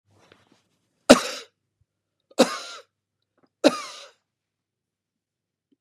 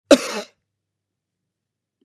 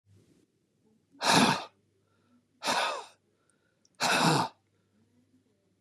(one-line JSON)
{"three_cough_length": "5.8 s", "three_cough_amplitude": 32768, "three_cough_signal_mean_std_ratio": 0.18, "cough_length": "2.0 s", "cough_amplitude": 32767, "cough_signal_mean_std_ratio": 0.19, "exhalation_length": "5.8 s", "exhalation_amplitude": 10597, "exhalation_signal_mean_std_ratio": 0.37, "survey_phase": "beta (2021-08-13 to 2022-03-07)", "age": "65+", "gender": "Male", "wearing_mask": "No", "symptom_none": true, "smoker_status": "Ex-smoker", "respiratory_condition_asthma": false, "respiratory_condition_other": false, "recruitment_source": "REACT", "submission_delay": "2 days", "covid_test_result": "Negative", "covid_test_method": "RT-qPCR"}